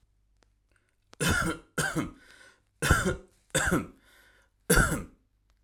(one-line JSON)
{"cough_length": "5.6 s", "cough_amplitude": 12151, "cough_signal_mean_std_ratio": 0.43, "survey_phase": "alpha (2021-03-01 to 2021-08-12)", "age": "18-44", "gender": "Male", "wearing_mask": "No", "symptom_none": true, "smoker_status": "Current smoker (e-cigarettes or vapes only)", "respiratory_condition_asthma": false, "respiratory_condition_other": false, "recruitment_source": "REACT", "submission_delay": "2 days", "covid_test_result": "Negative", "covid_test_method": "RT-qPCR"}